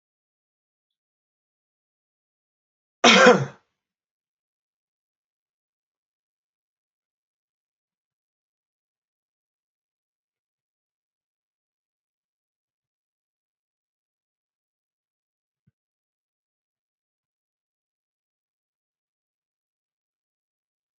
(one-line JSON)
{"cough_length": "21.0 s", "cough_amplitude": 28193, "cough_signal_mean_std_ratio": 0.1, "survey_phase": "beta (2021-08-13 to 2022-03-07)", "age": "65+", "gender": "Male", "wearing_mask": "No", "symptom_none": true, "smoker_status": "Ex-smoker", "respiratory_condition_asthma": false, "respiratory_condition_other": false, "recruitment_source": "REACT", "submission_delay": "5 days", "covid_test_result": "Negative", "covid_test_method": "RT-qPCR", "influenza_a_test_result": "Negative", "influenza_b_test_result": "Negative"}